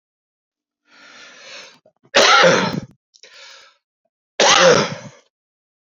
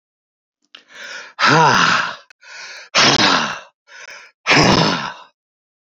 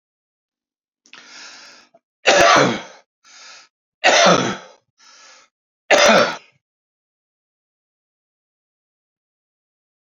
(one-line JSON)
{"cough_length": "6.0 s", "cough_amplitude": 29626, "cough_signal_mean_std_ratio": 0.37, "exhalation_length": "5.9 s", "exhalation_amplitude": 32768, "exhalation_signal_mean_std_ratio": 0.5, "three_cough_length": "10.2 s", "three_cough_amplitude": 32082, "three_cough_signal_mean_std_ratio": 0.31, "survey_phase": "alpha (2021-03-01 to 2021-08-12)", "age": "45-64", "gender": "Male", "wearing_mask": "No", "symptom_cough_any": true, "symptom_shortness_of_breath": true, "smoker_status": "Current smoker (11 or more cigarettes per day)", "respiratory_condition_asthma": true, "respiratory_condition_other": true, "recruitment_source": "REACT", "submission_delay": "2 days", "covid_test_result": "Negative", "covid_test_method": "RT-qPCR"}